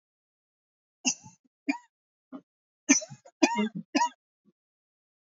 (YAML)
three_cough_length: 5.2 s
three_cough_amplitude: 15097
three_cough_signal_mean_std_ratio: 0.28
survey_phase: beta (2021-08-13 to 2022-03-07)
age: 18-44
gender: Female
wearing_mask: 'No'
symptom_cough_any: true
symptom_shortness_of_breath: true
symptom_sore_throat: true
symptom_fatigue: true
symptom_headache: true
symptom_onset: 4 days
smoker_status: Never smoked
respiratory_condition_asthma: false
respiratory_condition_other: false
recruitment_source: Test and Trace
submission_delay: 1 day
covid_test_result: Positive
covid_test_method: RT-qPCR
covid_ct_value: 27.7
covid_ct_gene: N gene